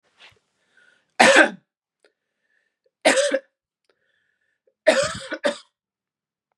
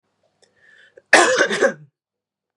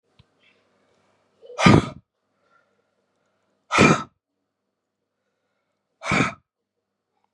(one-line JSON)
{"three_cough_length": "6.6 s", "three_cough_amplitude": 32753, "three_cough_signal_mean_std_ratio": 0.29, "cough_length": "2.6 s", "cough_amplitude": 32768, "cough_signal_mean_std_ratio": 0.36, "exhalation_length": "7.3 s", "exhalation_amplitude": 29872, "exhalation_signal_mean_std_ratio": 0.24, "survey_phase": "beta (2021-08-13 to 2022-03-07)", "age": "18-44", "gender": "Female", "wearing_mask": "No", "symptom_none": true, "symptom_onset": "12 days", "smoker_status": "Ex-smoker", "respiratory_condition_asthma": false, "respiratory_condition_other": false, "recruitment_source": "REACT", "submission_delay": "1 day", "covid_test_result": "Positive", "covid_test_method": "RT-qPCR", "covid_ct_value": 35.0, "covid_ct_gene": "E gene", "influenza_a_test_result": "Negative", "influenza_b_test_result": "Negative"}